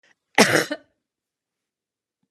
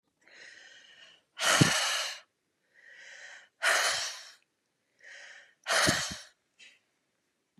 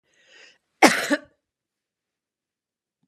{
  "cough_length": "2.3 s",
  "cough_amplitude": 32032,
  "cough_signal_mean_std_ratio": 0.25,
  "exhalation_length": "7.6 s",
  "exhalation_amplitude": 14272,
  "exhalation_signal_mean_std_ratio": 0.4,
  "three_cough_length": "3.1 s",
  "three_cough_amplitude": 32674,
  "three_cough_signal_mean_std_ratio": 0.21,
  "survey_phase": "beta (2021-08-13 to 2022-03-07)",
  "age": "45-64",
  "gender": "Female",
  "wearing_mask": "No",
  "symptom_none": true,
  "smoker_status": "Never smoked",
  "respiratory_condition_asthma": false,
  "respiratory_condition_other": false,
  "recruitment_source": "REACT",
  "submission_delay": "1 day",
  "covid_test_result": "Negative",
  "covid_test_method": "RT-qPCR",
  "influenza_a_test_result": "Negative",
  "influenza_b_test_result": "Negative"
}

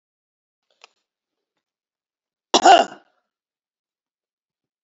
{
  "cough_length": "4.8 s",
  "cough_amplitude": 29120,
  "cough_signal_mean_std_ratio": 0.18,
  "survey_phase": "beta (2021-08-13 to 2022-03-07)",
  "age": "65+",
  "gender": "Female",
  "wearing_mask": "No",
  "symptom_shortness_of_breath": true,
  "smoker_status": "Ex-smoker",
  "respiratory_condition_asthma": false,
  "respiratory_condition_other": true,
  "recruitment_source": "REACT",
  "submission_delay": "2 days",
  "covid_test_result": "Negative",
  "covid_test_method": "RT-qPCR",
  "influenza_a_test_result": "Negative",
  "influenza_b_test_result": "Negative"
}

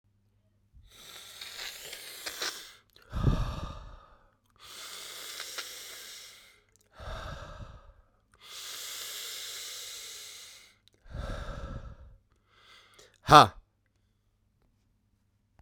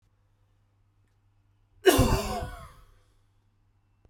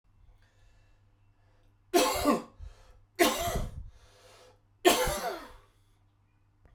{
  "exhalation_length": "15.6 s",
  "exhalation_amplitude": 29804,
  "exhalation_signal_mean_std_ratio": 0.26,
  "cough_length": "4.1 s",
  "cough_amplitude": 17544,
  "cough_signal_mean_std_ratio": 0.28,
  "three_cough_length": "6.7 s",
  "three_cough_amplitude": 13116,
  "three_cough_signal_mean_std_ratio": 0.38,
  "survey_phase": "beta (2021-08-13 to 2022-03-07)",
  "age": "18-44",
  "gender": "Male",
  "wearing_mask": "No",
  "symptom_cough_any": true,
  "symptom_runny_or_blocked_nose": true,
  "symptom_shortness_of_breath": true,
  "symptom_sore_throat": true,
  "symptom_abdominal_pain": true,
  "symptom_fatigue": true,
  "symptom_headache": true,
  "symptom_onset": "2 days",
  "smoker_status": "Ex-smoker",
  "respiratory_condition_asthma": false,
  "respiratory_condition_other": false,
  "recruitment_source": "Test and Trace",
  "submission_delay": "2 days",
  "covid_test_result": "Positive",
  "covid_test_method": "RT-qPCR",
  "covid_ct_value": 16.6,
  "covid_ct_gene": "ORF1ab gene",
  "covid_ct_mean": 17.0,
  "covid_viral_load": "2600000 copies/ml",
  "covid_viral_load_category": "High viral load (>1M copies/ml)"
}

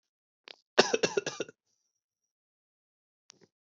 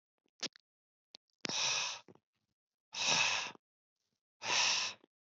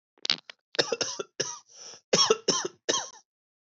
{
  "three_cough_length": "3.8 s",
  "three_cough_amplitude": 15508,
  "three_cough_signal_mean_std_ratio": 0.2,
  "exhalation_length": "5.4 s",
  "exhalation_amplitude": 4372,
  "exhalation_signal_mean_std_ratio": 0.44,
  "cough_length": "3.8 s",
  "cough_amplitude": 16117,
  "cough_signal_mean_std_ratio": 0.38,
  "survey_phase": "beta (2021-08-13 to 2022-03-07)",
  "age": "45-64",
  "gender": "Male",
  "wearing_mask": "No",
  "symptom_cough_any": true,
  "symptom_runny_or_blocked_nose": true,
  "symptom_shortness_of_breath": true,
  "symptom_diarrhoea": true,
  "symptom_fatigue": true,
  "smoker_status": "Never smoked",
  "respiratory_condition_asthma": false,
  "respiratory_condition_other": false,
  "recruitment_source": "Test and Trace",
  "submission_delay": "2 days",
  "covid_test_result": "Positive",
  "covid_test_method": "RT-qPCR"
}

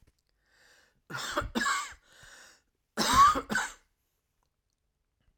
{
  "cough_length": "5.4 s",
  "cough_amplitude": 10117,
  "cough_signal_mean_std_ratio": 0.35,
  "survey_phase": "alpha (2021-03-01 to 2021-08-12)",
  "age": "65+",
  "gender": "Male",
  "wearing_mask": "No",
  "symptom_none": true,
  "smoker_status": "Never smoked",
  "respiratory_condition_asthma": false,
  "respiratory_condition_other": false,
  "recruitment_source": "REACT",
  "submission_delay": "3 days",
  "covid_test_result": "Negative",
  "covid_test_method": "RT-qPCR"
}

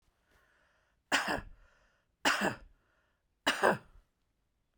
{
  "three_cough_length": "4.8 s",
  "three_cough_amplitude": 9579,
  "three_cough_signal_mean_std_ratio": 0.33,
  "survey_phase": "beta (2021-08-13 to 2022-03-07)",
  "age": "45-64",
  "gender": "Female",
  "wearing_mask": "No",
  "symptom_none": true,
  "smoker_status": "Ex-smoker",
  "respiratory_condition_asthma": false,
  "respiratory_condition_other": false,
  "recruitment_source": "REACT",
  "submission_delay": "1 day",
  "covid_test_result": "Negative",
  "covid_test_method": "RT-qPCR"
}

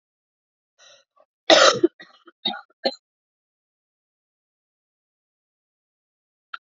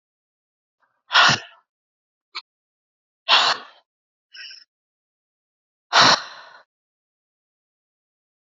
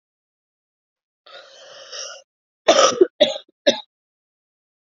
{
  "three_cough_length": "6.7 s",
  "three_cough_amplitude": 32767,
  "three_cough_signal_mean_std_ratio": 0.19,
  "exhalation_length": "8.5 s",
  "exhalation_amplitude": 30143,
  "exhalation_signal_mean_std_ratio": 0.25,
  "cough_length": "4.9 s",
  "cough_amplitude": 28799,
  "cough_signal_mean_std_ratio": 0.27,
  "survey_phase": "alpha (2021-03-01 to 2021-08-12)",
  "age": "18-44",
  "gender": "Female",
  "wearing_mask": "No",
  "symptom_cough_any": true,
  "symptom_shortness_of_breath": true,
  "symptom_fatigue": true,
  "symptom_onset": "5 days",
  "smoker_status": "Never smoked",
  "respiratory_condition_asthma": true,
  "respiratory_condition_other": false,
  "recruitment_source": "Test and Trace",
  "submission_delay": "1 day",
  "covid_test_result": "Positive",
  "covid_test_method": "RT-qPCR",
  "covid_ct_value": 25.1,
  "covid_ct_gene": "ORF1ab gene",
  "covid_ct_mean": 26.2,
  "covid_viral_load": "2600 copies/ml",
  "covid_viral_load_category": "Minimal viral load (< 10K copies/ml)"
}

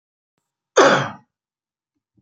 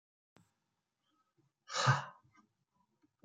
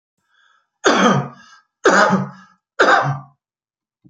{
  "cough_length": "2.2 s",
  "cough_amplitude": 28954,
  "cough_signal_mean_std_ratio": 0.28,
  "exhalation_length": "3.2 s",
  "exhalation_amplitude": 4477,
  "exhalation_signal_mean_std_ratio": 0.23,
  "three_cough_length": "4.1 s",
  "three_cough_amplitude": 31038,
  "three_cough_signal_mean_std_ratio": 0.45,
  "survey_phase": "beta (2021-08-13 to 2022-03-07)",
  "age": "65+",
  "gender": "Male",
  "wearing_mask": "No",
  "symptom_none": true,
  "smoker_status": "Never smoked",
  "respiratory_condition_asthma": false,
  "respiratory_condition_other": false,
  "recruitment_source": "REACT",
  "submission_delay": "1 day",
  "covid_test_result": "Negative",
  "covid_test_method": "RT-qPCR"
}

